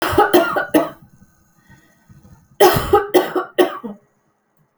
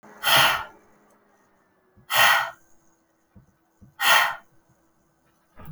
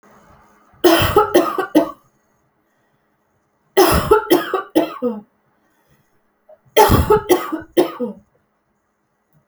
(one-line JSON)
{"cough_length": "4.8 s", "cough_amplitude": 32768, "cough_signal_mean_std_ratio": 0.45, "exhalation_length": "5.7 s", "exhalation_amplitude": 23532, "exhalation_signal_mean_std_ratio": 0.36, "three_cough_length": "9.5 s", "three_cough_amplitude": 32768, "three_cough_signal_mean_std_ratio": 0.42, "survey_phase": "alpha (2021-03-01 to 2021-08-12)", "age": "45-64", "gender": "Female", "wearing_mask": "No", "symptom_none": true, "smoker_status": "Ex-smoker", "respiratory_condition_asthma": false, "respiratory_condition_other": false, "recruitment_source": "REACT", "submission_delay": "4 days", "covid_test_result": "Negative", "covid_test_method": "RT-qPCR"}